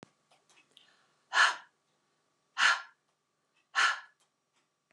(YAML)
exhalation_length: 4.9 s
exhalation_amplitude: 9052
exhalation_signal_mean_std_ratio: 0.28
survey_phase: beta (2021-08-13 to 2022-03-07)
age: 45-64
gender: Female
wearing_mask: 'No'
symptom_none: true
smoker_status: Ex-smoker
respiratory_condition_asthma: false
respiratory_condition_other: false
recruitment_source: REACT
submission_delay: 2 days
covid_test_result: Negative
covid_test_method: RT-qPCR